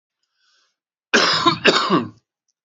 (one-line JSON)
{"cough_length": "2.6 s", "cough_amplitude": 32768, "cough_signal_mean_std_ratio": 0.45, "survey_phase": "beta (2021-08-13 to 2022-03-07)", "age": "18-44", "gender": "Male", "wearing_mask": "No", "symptom_shortness_of_breath": true, "symptom_headache": true, "smoker_status": "Current smoker (11 or more cigarettes per day)", "respiratory_condition_asthma": true, "respiratory_condition_other": false, "recruitment_source": "Test and Trace", "submission_delay": "1 day", "covid_test_result": "Positive", "covid_test_method": "LFT"}